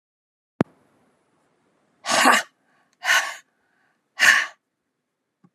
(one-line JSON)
{"exhalation_length": "5.5 s", "exhalation_amplitude": 28830, "exhalation_signal_mean_std_ratio": 0.3, "survey_phase": "alpha (2021-03-01 to 2021-08-12)", "age": "65+", "gender": "Female", "wearing_mask": "No", "symptom_none": true, "smoker_status": "Never smoked", "respiratory_condition_asthma": false, "respiratory_condition_other": false, "recruitment_source": "REACT", "submission_delay": "1 day", "covid_test_result": "Negative", "covid_test_method": "RT-qPCR"}